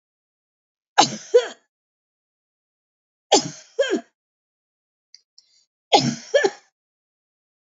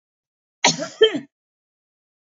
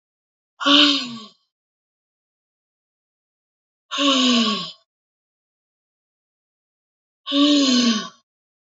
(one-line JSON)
{"three_cough_length": "7.8 s", "three_cough_amplitude": 28480, "three_cough_signal_mean_std_ratio": 0.26, "cough_length": "2.3 s", "cough_amplitude": 30216, "cough_signal_mean_std_ratio": 0.27, "exhalation_length": "8.8 s", "exhalation_amplitude": 29671, "exhalation_signal_mean_std_ratio": 0.39, "survey_phase": "beta (2021-08-13 to 2022-03-07)", "age": "65+", "gender": "Female", "wearing_mask": "No", "symptom_none": true, "smoker_status": "Never smoked", "respiratory_condition_asthma": false, "respiratory_condition_other": false, "recruitment_source": "REACT", "submission_delay": "3 days", "covid_test_result": "Negative", "covid_test_method": "RT-qPCR"}